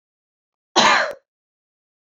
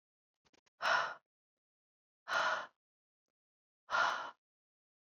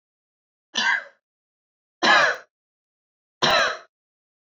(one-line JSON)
{"cough_length": "2.0 s", "cough_amplitude": 27561, "cough_signal_mean_std_ratio": 0.33, "exhalation_length": "5.1 s", "exhalation_amplitude": 3118, "exhalation_signal_mean_std_ratio": 0.35, "three_cough_length": "4.5 s", "three_cough_amplitude": 20026, "three_cough_signal_mean_std_ratio": 0.36, "survey_phase": "alpha (2021-03-01 to 2021-08-12)", "age": "18-44", "gender": "Female", "wearing_mask": "No", "symptom_none": true, "smoker_status": "Never smoked", "respiratory_condition_asthma": false, "respiratory_condition_other": false, "recruitment_source": "REACT", "submission_delay": "2 days", "covid_test_result": "Negative", "covid_test_method": "RT-qPCR"}